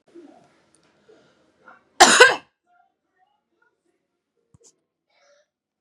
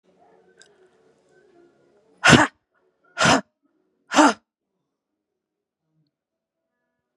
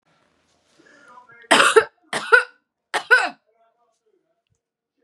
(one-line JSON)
{"cough_length": "5.8 s", "cough_amplitude": 32768, "cough_signal_mean_std_ratio": 0.19, "exhalation_length": "7.2 s", "exhalation_amplitude": 32767, "exhalation_signal_mean_std_ratio": 0.23, "three_cough_length": "5.0 s", "three_cough_amplitude": 32767, "three_cough_signal_mean_std_ratio": 0.29, "survey_phase": "beta (2021-08-13 to 2022-03-07)", "age": "18-44", "gender": "Female", "wearing_mask": "No", "symptom_runny_or_blocked_nose": true, "symptom_sore_throat": true, "symptom_fatigue": true, "symptom_headache": true, "symptom_change_to_sense_of_smell_or_taste": true, "symptom_onset": "4 days", "smoker_status": "Ex-smoker", "respiratory_condition_asthma": false, "respiratory_condition_other": false, "recruitment_source": "Test and Trace", "submission_delay": "1 day", "covid_test_result": "Positive", "covid_test_method": "RT-qPCR", "covid_ct_value": 18.2, "covid_ct_gene": "N gene"}